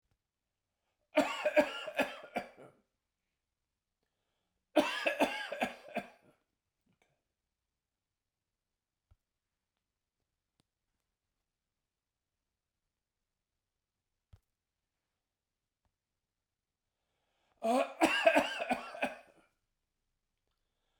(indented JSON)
{
  "cough_length": "21.0 s",
  "cough_amplitude": 8757,
  "cough_signal_mean_std_ratio": 0.26,
  "survey_phase": "beta (2021-08-13 to 2022-03-07)",
  "age": "65+",
  "gender": "Male",
  "wearing_mask": "No",
  "symptom_cough_any": true,
  "symptom_fatigue": true,
  "symptom_change_to_sense_of_smell_or_taste": true,
  "symptom_other": true,
  "symptom_onset": "5 days",
  "smoker_status": "Never smoked",
  "respiratory_condition_asthma": false,
  "respiratory_condition_other": false,
  "recruitment_source": "Test and Trace",
  "submission_delay": "3 days",
  "covid_test_result": "Positive",
  "covid_test_method": "RT-qPCR",
  "covid_ct_value": 21.5,
  "covid_ct_gene": "ORF1ab gene",
  "covid_ct_mean": 22.3,
  "covid_viral_load": "48000 copies/ml",
  "covid_viral_load_category": "Low viral load (10K-1M copies/ml)"
}